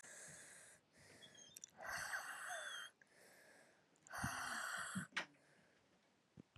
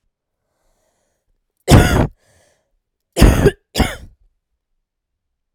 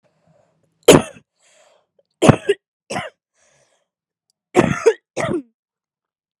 exhalation_length: 6.6 s
exhalation_amplitude: 986
exhalation_signal_mean_std_ratio: 0.6
cough_length: 5.5 s
cough_amplitude: 32768
cough_signal_mean_std_ratio: 0.3
three_cough_length: 6.4 s
three_cough_amplitude: 32768
three_cough_signal_mean_std_ratio: 0.26
survey_phase: alpha (2021-03-01 to 2021-08-12)
age: 18-44
gender: Female
wearing_mask: 'No'
symptom_cough_any: true
symptom_fatigue: true
symptom_fever_high_temperature: true
symptom_headache: true
symptom_change_to_sense_of_smell_or_taste: true
symptom_onset: 3 days
smoker_status: Never smoked
respiratory_condition_asthma: false
respiratory_condition_other: false
recruitment_source: Test and Trace
submission_delay: 1 day
covid_test_result: Positive
covid_test_method: RT-qPCR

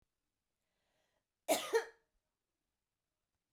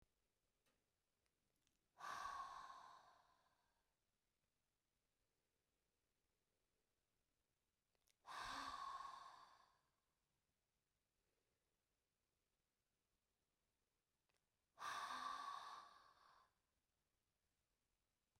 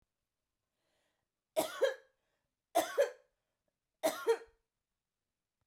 cough_length: 3.5 s
cough_amplitude: 3430
cough_signal_mean_std_ratio: 0.22
exhalation_length: 18.4 s
exhalation_amplitude: 356
exhalation_signal_mean_std_ratio: 0.36
three_cough_length: 5.7 s
three_cough_amplitude: 3686
three_cough_signal_mean_std_ratio: 0.29
survey_phase: beta (2021-08-13 to 2022-03-07)
age: 45-64
gender: Female
wearing_mask: 'No'
symptom_none: true
smoker_status: Never smoked
respiratory_condition_asthma: false
respiratory_condition_other: false
recruitment_source: REACT
submission_delay: 3 days
covid_test_result: Negative
covid_test_method: RT-qPCR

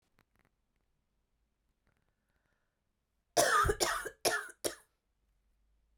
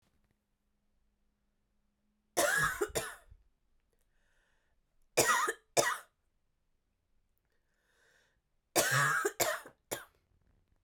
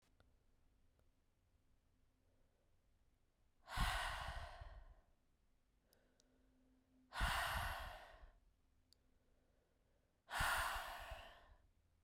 cough_length: 6.0 s
cough_amplitude: 8553
cough_signal_mean_std_ratio: 0.3
three_cough_length: 10.8 s
three_cough_amplitude: 9272
three_cough_signal_mean_std_ratio: 0.34
exhalation_length: 12.0 s
exhalation_amplitude: 1232
exhalation_signal_mean_std_ratio: 0.4
survey_phase: beta (2021-08-13 to 2022-03-07)
age: 18-44
gender: Female
wearing_mask: 'No'
symptom_cough_any: true
symptom_runny_or_blocked_nose: true
symptom_fatigue: true
symptom_headache: true
symptom_change_to_sense_of_smell_or_taste: true
symptom_loss_of_taste: true
symptom_onset: 2 days
smoker_status: Never smoked
respiratory_condition_asthma: false
respiratory_condition_other: false
recruitment_source: Test and Trace
submission_delay: 2 days
covid_test_result: Positive
covid_test_method: RT-qPCR
covid_ct_value: 17.2
covid_ct_gene: ORF1ab gene
covid_ct_mean: 17.4
covid_viral_load: 1900000 copies/ml
covid_viral_load_category: High viral load (>1M copies/ml)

